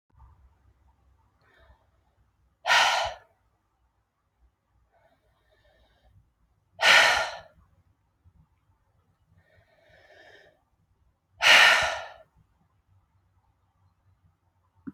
{
  "exhalation_length": "14.9 s",
  "exhalation_amplitude": 22179,
  "exhalation_signal_mean_std_ratio": 0.25,
  "survey_phase": "alpha (2021-03-01 to 2021-08-12)",
  "age": "18-44",
  "gender": "Female",
  "wearing_mask": "No",
  "symptom_cough_any": true,
  "symptom_new_continuous_cough": true,
  "symptom_fever_high_temperature": true,
  "symptom_change_to_sense_of_smell_or_taste": true,
  "symptom_loss_of_taste": true,
  "symptom_onset": "5 days",
  "smoker_status": "Never smoked",
  "respiratory_condition_asthma": false,
  "respiratory_condition_other": false,
  "recruitment_source": "Test and Trace",
  "submission_delay": "2 days",
  "covid_test_result": "Positive",
  "covid_test_method": "RT-qPCR",
  "covid_ct_value": 14.3,
  "covid_ct_gene": "N gene",
  "covid_ct_mean": 14.7,
  "covid_viral_load": "16000000 copies/ml",
  "covid_viral_load_category": "High viral load (>1M copies/ml)"
}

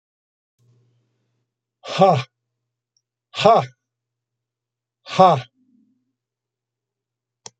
{
  "exhalation_length": "7.6 s",
  "exhalation_amplitude": 27293,
  "exhalation_signal_mean_std_ratio": 0.25,
  "survey_phase": "beta (2021-08-13 to 2022-03-07)",
  "age": "65+",
  "gender": "Male",
  "wearing_mask": "No",
  "symptom_none": true,
  "smoker_status": "Never smoked",
  "respiratory_condition_asthma": false,
  "respiratory_condition_other": false,
  "recruitment_source": "REACT",
  "submission_delay": "2 days",
  "covid_test_result": "Negative",
  "covid_test_method": "RT-qPCR"
}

